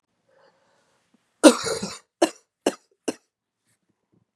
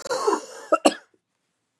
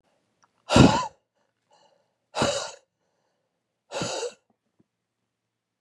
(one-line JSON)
{"three_cough_length": "4.4 s", "three_cough_amplitude": 32767, "three_cough_signal_mean_std_ratio": 0.2, "cough_length": "1.8 s", "cough_amplitude": 29918, "cough_signal_mean_std_ratio": 0.38, "exhalation_length": "5.8 s", "exhalation_amplitude": 25744, "exhalation_signal_mean_std_ratio": 0.26, "survey_phase": "beta (2021-08-13 to 2022-03-07)", "age": "45-64", "gender": "Female", "wearing_mask": "No", "symptom_cough_any": true, "symptom_runny_or_blocked_nose": true, "symptom_shortness_of_breath": true, "symptom_sore_throat": true, "symptom_abdominal_pain": true, "symptom_fatigue": true, "symptom_fever_high_temperature": true, "symptom_headache": true, "symptom_change_to_sense_of_smell_or_taste": true, "symptom_loss_of_taste": true, "symptom_onset": "3 days", "smoker_status": "Never smoked", "respiratory_condition_asthma": false, "respiratory_condition_other": true, "recruitment_source": "Test and Trace", "submission_delay": "2 days", "covid_test_result": "Positive", "covid_test_method": "RT-qPCR", "covid_ct_value": 23.1, "covid_ct_gene": "ORF1ab gene", "covid_ct_mean": 23.8, "covid_viral_load": "16000 copies/ml", "covid_viral_load_category": "Low viral load (10K-1M copies/ml)"}